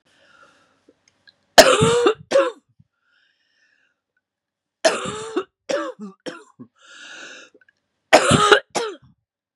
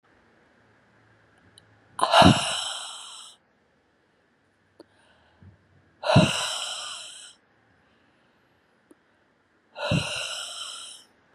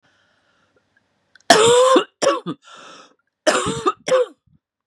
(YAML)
three_cough_length: 9.6 s
three_cough_amplitude: 32768
three_cough_signal_mean_std_ratio: 0.33
exhalation_length: 11.3 s
exhalation_amplitude: 24925
exhalation_signal_mean_std_ratio: 0.31
cough_length: 4.9 s
cough_amplitude: 32768
cough_signal_mean_std_ratio: 0.43
survey_phase: beta (2021-08-13 to 2022-03-07)
age: 45-64
gender: Female
wearing_mask: 'No'
symptom_cough_any: true
symptom_runny_or_blocked_nose: true
symptom_fatigue: true
symptom_headache: true
symptom_onset: 3 days
smoker_status: Never smoked
respiratory_condition_asthma: false
respiratory_condition_other: false
recruitment_source: Test and Trace
submission_delay: 1 day
covid_test_result: Positive
covid_test_method: RT-qPCR
covid_ct_value: 13.5
covid_ct_gene: ORF1ab gene